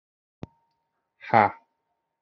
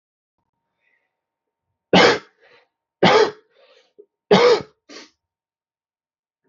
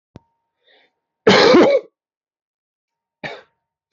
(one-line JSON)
{"exhalation_length": "2.2 s", "exhalation_amplitude": 23892, "exhalation_signal_mean_std_ratio": 0.2, "three_cough_length": "6.5 s", "three_cough_amplitude": 29666, "three_cough_signal_mean_std_ratio": 0.29, "cough_length": "3.9 s", "cough_amplitude": 30430, "cough_signal_mean_std_ratio": 0.33, "survey_phase": "alpha (2021-03-01 to 2021-08-12)", "age": "18-44", "gender": "Male", "wearing_mask": "No", "symptom_cough_any": true, "symptom_onset": "5 days", "smoker_status": "Current smoker (e-cigarettes or vapes only)", "respiratory_condition_asthma": false, "respiratory_condition_other": false, "recruitment_source": "Test and Trace", "submission_delay": "2 days", "covid_test_result": "Positive", "covid_test_method": "RT-qPCR", "covid_ct_value": 14.9, "covid_ct_gene": "ORF1ab gene", "covid_ct_mean": 15.3, "covid_viral_load": "9300000 copies/ml", "covid_viral_load_category": "High viral load (>1M copies/ml)"}